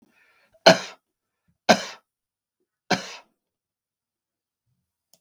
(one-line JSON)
{"cough_length": "5.2 s", "cough_amplitude": 32768, "cough_signal_mean_std_ratio": 0.18, "survey_phase": "beta (2021-08-13 to 2022-03-07)", "age": "65+", "gender": "Male", "wearing_mask": "No", "symptom_none": true, "smoker_status": "Never smoked", "respiratory_condition_asthma": false, "respiratory_condition_other": false, "recruitment_source": "REACT", "submission_delay": "1 day", "covid_test_result": "Negative", "covid_test_method": "RT-qPCR"}